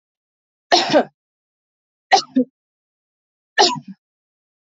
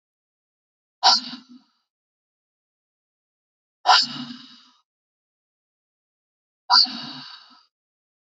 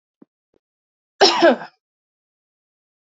{
  "three_cough_length": "4.6 s",
  "three_cough_amplitude": 31048,
  "three_cough_signal_mean_std_ratio": 0.29,
  "exhalation_length": "8.4 s",
  "exhalation_amplitude": 25688,
  "exhalation_signal_mean_std_ratio": 0.23,
  "cough_length": "3.1 s",
  "cough_amplitude": 29234,
  "cough_signal_mean_std_ratio": 0.26,
  "survey_phase": "alpha (2021-03-01 to 2021-08-12)",
  "age": "18-44",
  "gender": "Female",
  "wearing_mask": "No",
  "symptom_none": true,
  "smoker_status": "Current smoker (e-cigarettes or vapes only)",
  "respiratory_condition_asthma": false,
  "respiratory_condition_other": false,
  "recruitment_source": "REACT",
  "submission_delay": "2 days",
  "covid_test_result": "Negative",
  "covid_test_method": "RT-qPCR"
}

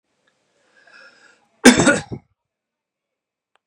{
  "cough_length": "3.7 s",
  "cough_amplitude": 32768,
  "cough_signal_mean_std_ratio": 0.23,
  "survey_phase": "beta (2021-08-13 to 2022-03-07)",
  "age": "18-44",
  "gender": "Male",
  "wearing_mask": "No",
  "symptom_cough_any": true,
  "symptom_runny_or_blocked_nose": true,
  "symptom_shortness_of_breath": true,
  "symptom_sore_throat": true,
  "symptom_fatigue": true,
  "symptom_onset": "4 days",
  "smoker_status": "Ex-smoker",
  "respiratory_condition_asthma": false,
  "respiratory_condition_other": false,
  "recruitment_source": "Test and Trace",
  "submission_delay": "2 days",
  "covid_test_result": "Positive",
  "covid_test_method": "RT-qPCR"
}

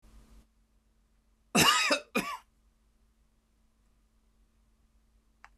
{
  "cough_length": "5.6 s",
  "cough_amplitude": 10995,
  "cough_signal_mean_std_ratio": 0.27,
  "survey_phase": "beta (2021-08-13 to 2022-03-07)",
  "age": "65+",
  "gender": "Male",
  "wearing_mask": "No",
  "symptom_none": true,
  "smoker_status": "Never smoked",
  "respiratory_condition_asthma": false,
  "respiratory_condition_other": false,
  "recruitment_source": "REACT",
  "submission_delay": "5 days",
  "covid_test_result": "Negative",
  "covid_test_method": "RT-qPCR",
  "influenza_a_test_result": "Negative",
  "influenza_b_test_result": "Negative"
}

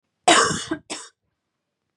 {
  "cough_length": "2.0 s",
  "cough_amplitude": 25354,
  "cough_signal_mean_std_ratio": 0.35,
  "survey_phase": "beta (2021-08-13 to 2022-03-07)",
  "age": "18-44",
  "gender": "Female",
  "wearing_mask": "No",
  "symptom_headache": true,
  "smoker_status": "Never smoked",
  "respiratory_condition_asthma": false,
  "respiratory_condition_other": false,
  "recruitment_source": "Test and Trace",
  "submission_delay": "1 day",
  "covid_test_result": "Positive",
  "covid_test_method": "RT-qPCR",
  "covid_ct_value": 29.6,
  "covid_ct_gene": "N gene",
  "covid_ct_mean": 30.5,
  "covid_viral_load": "100 copies/ml",
  "covid_viral_load_category": "Minimal viral load (< 10K copies/ml)"
}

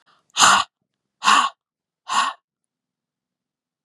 {
  "exhalation_length": "3.8 s",
  "exhalation_amplitude": 32767,
  "exhalation_signal_mean_std_ratio": 0.33,
  "survey_phase": "beta (2021-08-13 to 2022-03-07)",
  "age": "45-64",
  "gender": "Female",
  "wearing_mask": "No",
  "symptom_cough_any": true,
  "symptom_runny_or_blocked_nose": true,
  "symptom_sore_throat": true,
  "symptom_fatigue": true,
  "symptom_change_to_sense_of_smell_or_taste": true,
  "symptom_onset": "3 days",
  "smoker_status": "Never smoked",
  "respiratory_condition_asthma": false,
  "respiratory_condition_other": false,
  "recruitment_source": "Test and Trace",
  "submission_delay": "1 day",
  "covid_test_result": "Positive",
  "covid_test_method": "RT-qPCR",
  "covid_ct_value": 22.1,
  "covid_ct_gene": "N gene"
}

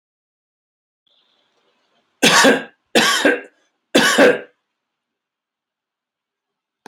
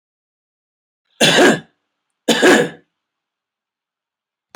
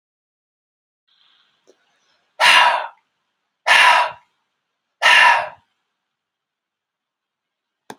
{
  "three_cough_length": "6.9 s",
  "three_cough_amplitude": 32768,
  "three_cough_signal_mean_std_ratio": 0.33,
  "cough_length": "4.6 s",
  "cough_amplitude": 30363,
  "cough_signal_mean_std_ratio": 0.32,
  "exhalation_length": "8.0 s",
  "exhalation_amplitude": 32767,
  "exhalation_signal_mean_std_ratio": 0.32,
  "survey_phase": "alpha (2021-03-01 to 2021-08-12)",
  "age": "65+",
  "gender": "Male",
  "wearing_mask": "No",
  "symptom_none": true,
  "smoker_status": "Ex-smoker",
  "respiratory_condition_asthma": false,
  "respiratory_condition_other": false,
  "recruitment_source": "REACT",
  "submission_delay": "1 day",
  "covid_test_result": "Negative",
  "covid_test_method": "RT-qPCR"
}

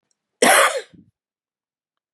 {
  "cough_length": "2.1 s",
  "cough_amplitude": 28459,
  "cough_signal_mean_std_ratio": 0.33,
  "survey_phase": "beta (2021-08-13 to 2022-03-07)",
  "age": "45-64",
  "gender": "Female",
  "wearing_mask": "No",
  "symptom_cough_any": true,
  "symptom_runny_or_blocked_nose": true,
  "symptom_sore_throat": true,
  "symptom_abdominal_pain": true,
  "symptom_fatigue": true,
  "symptom_headache": true,
  "symptom_change_to_sense_of_smell_or_taste": true,
  "symptom_loss_of_taste": true,
  "smoker_status": "Never smoked",
  "respiratory_condition_asthma": true,
  "respiratory_condition_other": false,
  "recruitment_source": "Test and Trace",
  "submission_delay": "6 days",
  "covid_test_result": "Positive",
  "covid_test_method": "LFT"
}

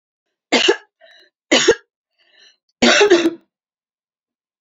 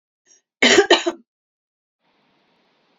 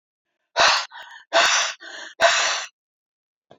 {
  "three_cough_length": "4.6 s",
  "three_cough_amplitude": 31056,
  "three_cough_signal_mean_std_ratio": 0.37,
  "cough_length": "3.0 s",
  "cough_amplitude": 30699,
  "cough_signal_mean_std_ratio": 0.28,
  "exhalation_length": "3.6 s",
  "exhalation_amplitude": 24283,
  "exhalation_signal_mean_std_ratio": 0.47,
  "survey_phase": "alpha (2021-03-01 to 2021-08-12)",
  "age": "45-64",
  "gender": "Female",
  "wearing_mask": "No",
  "symptom_cough_any": true,
  "symptom_new_continuous_cough": true,
  "symptom_diarrhoea": true,
  "symptom_fatigue": true,
  "symptom_headache": true,
  "smoker_status": "Never smoked",
  "respiratory_condition_asthma": false,
  "respiratory_condition_other": false,
  "recruitment_source": "Test and Trace",
  "submission_delay": "2 days",
  "covid_test_result": "Positive",
  "covid_test_method": "LFT"
}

